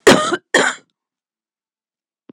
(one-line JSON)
{"cough_length": "2.3 s", "cough_amplitude": 26028, "cough_signal_mean_std_ratio": 0.33, "survey_phase": "beta (2021-08-13 to 2022-03-07)", "age": "45-64", "gender": "Female", "wearing_mask": "No", "symptom_none": true, "smoker_status": "Ex-smoker", "respiratory_condition_asthma": false, "respiratory_condition_other": false, "recruitment_source": "REACT", "submission_delay": "11 days", "covid_test_result": "Negative", "covid_test_method": "RT-qPCR", "influenza_a_test_result": "Unknown/Void", "influenza_b_test_result": "Unknown/Void"}